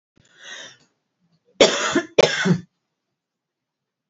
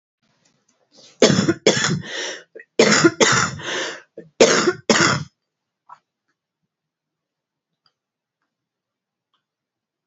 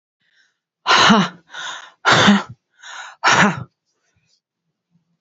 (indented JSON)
{
  "cough_length": "4.1 s",
  "cough_amplitude": 29137,
  "cough_signal_mean_std_ratio": 0.32,
  "three_cough_length": "10.1 s",
  "three_cough_amplitude": 32767,
  "three_cough_signal_mean_std_ratio": 0.36,
  "exhalation_length": "5.2 s",
  "exhalation_amplitude": 32667,
  "exhalation_signal_mean_std_ratio": 0.4,
  "survey_phase": "alpha (2021-03-01 to 2021-08-12)",
  "age": "45-64",
  "gender": "Female",
  "wearing_mask": "No",
  "symptom_none": true,
  "smoker_status": "Current smoker (11 or more cigarettes per day)",
  "respiratory_condition_asthma": false,
  "respiratory_condition_other": false,
  "recruitment_source": "REACT",
  "submission_delay": "1 day",
  "covid_test_result": "Negative",
  "covid_test_method": "RT-qPCR"
}